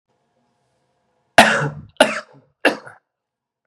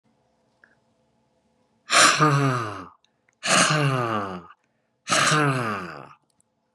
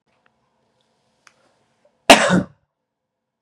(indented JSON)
{
  "three_cough_length": "3.7 s",
  "three_cough_amplitude": 32768,
  "three_cough_signal_mean_std_ratio": 0.27,
  "exhalation_length": "6.7 s",
  "exhalation_amplitude": 24655,
  "exhalation_signal_mean_std_ratio": 0.49,
  "cough_length": "3.4 s",
  "cough_amplitude": 32768,
  "cough_signal_mean_std_ratio": 0.21,
  "survey_phase": "beta (2021-08-13 to 2022-03-07)",
  "age": "18-44",
  "gender": "Male",
  "wearing_mask": "No",
  "symptom_none": true,
  "symptom_onset": "7 days",
  "smoker_status": "Never smoked",
  "respiratory_condition_asthma": false,
  "respiratory_condition_other": false,
  "recruitment_source": "Test and Trace",
  "submission_delay": "2 days",
  "covid_test_result": "Positive",
  "covid_test_method": "ePCR"
}